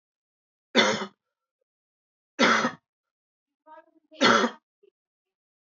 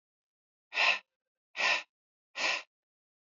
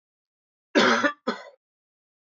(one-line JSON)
{"three_cough_length": "5.6 s", "three_cough_amplitude": 18771, "three_cough_signal_mean_std_ratio": 0.31, "exhalation_length": "3.3 s", "exhalation_amplitude": 6246, "exhalation_signal_mean_std_ratio": 0.36, "cough_length": "2.3 s", "cough_amplitude": 17294, "cough_signal_mean_std_ratio": 0.34, "survey_phase": "alpha (2021-03-01 to 2021-08-12)", "age": "18-44", "gender": "Male", "wearing_mask": "No", "symptom_cough_any": true, "symptom_diarrhoea": true, "symptom_fatigue": true, "symptom_headache": true, "symptom_change_to_sense_of_smell_or_taste": true, "symptom_onset": "5 days", "smoker_status": "Never smoked", "respiratory_condition_asthma": false, "respiratory_condition_other": false, "recruitment_source": "Test and Trace", "submission_delay": "2 days", "covid_test_result": "Positive", "covid_test_method": "RT-qPCR", "covid_ct_value": 14.9, "covid_ct_gene": "ORF1ab gene", "covid_ct_mean": 15.2, "covid_viral_load": "10000000 copies/ml", "covid_viral_load_category": "High viral load (>1M copies/ml)"}